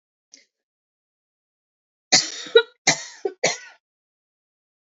{"three_cough_length": "4.9 s", "three_cough_amplitude": 28915, "three_cough_signal_mean_std_ratio": 0.23, "survey_phase": "beta (2021-08-13 to 2022-03-07)", "age": "45-64", "gender": "Female", "wearing_mask": "No", "symptom_cough_any": true, "symptom_new_continuous_cough": true, "symptom_runny_or_blocked_nose": true, "symptom_fatigue": true, "symptom_change_to_sense_of_smell_or_taste": true, "symptom_onset": "2 days", "smoker_status": "Current smoker (e-cigarettes or vapes only)", "respiratory_condition_asthma": false, "respiratory_condition_other": false, "recruitment_source": "Test and Trace", "submission_delay": "1 day", "covid_test_result": "Positive", "covid_test_method": "RT-qPCR", "covid_ct_value": 33.0, "covid_ct_gene": "N gene"}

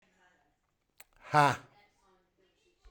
{"exhalation_length": "2.9 s", "exhalation_amplitude": 11818, "exhalation_signal_mean_std_ratio": 0.22, "survey_phase": "beta (2021-08-13 to 2022-03-07)", "age": "45-64", "gender": "Male", "wearing_mask": "No", "symptom_none": true, "smoker_status": "Never smoked", "respiratory_condition_asthma": false, "respiratory_condition_other": false, "recruitment_source": "REACT", "submission_delay": "4 days", "covid_test_result": "Negative", "covid_test_method": "RT-qPCR"}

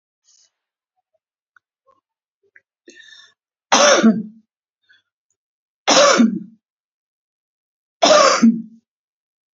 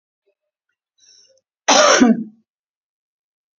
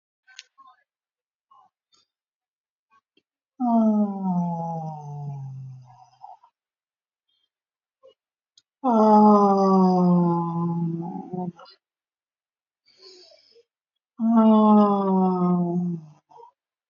{"three_cough_length": "9.6 s", "three_cough_amplitude": 32767, "three_cough_signal_mean_std_ratio": 0.33, "cough_length": "3.6 s", "cough_amplitude": 32688, "cough_signal_mean_std_ratio": 0.31, "exhalation_length": "16.9 s", "exhalation_amplitude": 17237, "exhalation_signal_mean_std_ratio": 0.49, "survey_phase": "beta (2021-08-13 to 2022-03-07)", "age": "65+", "gender": "Female", "wearing_mask": "No", "symptom_none": true, "smoker_status": "Ex-smoker", "respiratory_condition_asthma": false, "respiratory_condition_other": false, "recruitment_source": "REACT", "submission_delay": "1 day", "covid_test_result": "Negative", "covid_test_method": "RT-qPCR"}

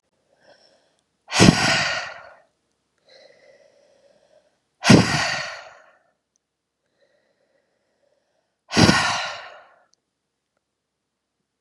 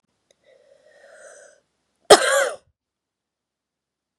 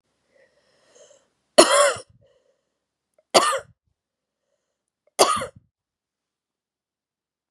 {"exhalation_length": "11.6 s", "exhalation_amplitude": 32768, "exhalation_signal_mean_std_ratio": 0.28, "cough_length": "4.2 s", "cough_amplitude": 32768, "cough_signal_mean_std_ratio": 0.2, "three_cough_length": "7.5 s", "three_cough_amplitude": 32768, "three_cough_signal_mean_std_ratio": 0.24, "survey_phase": "beta (2021-08-13 to 2022-03-07)", "age": "45-64", "gender": "Female", "wearing_mask": "No", "symptom_cough_any": true, "symptom_runny_or_blocked_nose": true, "symptom_sore_throat": true, "symptom_fatigue": true, "symptom_fever_high_temperature": true, "symptom_headache": true, "symptom_change_to_sense_of_smell_or_taste": true, "symptom_onset": "2 days", "smoker_status": "Ex-smoker", "respiratory_condition_asthma": false, "respiratory_condition_other": false, "recruitment_source": "REACT", "submission_delay": "2 days", "covid_test_result": "Positive", "covid_test_method": "RT-qPCR", "covid_ct_value": 22.5, "covid_ct_gene": "E gene", "influenza_a_test_result": "Negative", "influenza_b_test_result": "Negative"}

